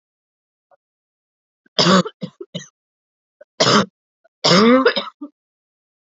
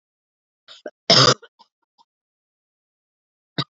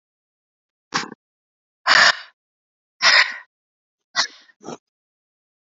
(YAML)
three_cough_length: 6.1 s
three_cough_amplitude: 32172
three_cough_signal_mean_std_ratio: 0.35
cough_length: 3.8 s
cough_amplitude: 31596
cough_signal_mean_std_ratio: 0.22
exhalation_length: 5.6 s
exhalation_amplitude: 29439
exhalation_signal_mean_std_ratio: 0.28
survey_phase: alpha (2021-03-01 to 2021-08-12)
age: 18-44
gender: Female
wearing_mask: 'No'
symptom_cough_any: true
symptom_new_continuous_cough: true
symptom_fatigue: true
symptom_fever_high_temperature: true
symptom_change_to_sense_of_smell_or_taste: true
symptom_loss_of_taste: true
symptom_onset: 4 days
smoker_status: Never smoked
respiratory_condition_asthma: false
respiratory_condition_other: false
recruitment_source: Test and Trace
submission_delay: 2 days
covid_test_result: Positive
covid_test_method: RT-qPCR
covid_ct_value: 19.1
covid_ct_gene: ORF1ab gene